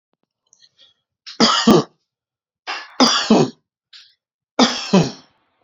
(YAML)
three_cough_length: 5.6 s
three_cough_amplitude: 29923
three_cough_signal_mean_std_ratio: 0.38
survey_phase: alpha (2021-03-01 to 2021-08-12)
age: 45-64
gender: Male
wearing_mask: 'No'
symptom_none: true
smoker_status: Ex-smoker
respiratory_condition_asthma: false
respiratory_condition_other: false
recruitment_source: REACT
submission_delay: 2 days
covid_test_result: Negative
covid_test_method: RT-qPCR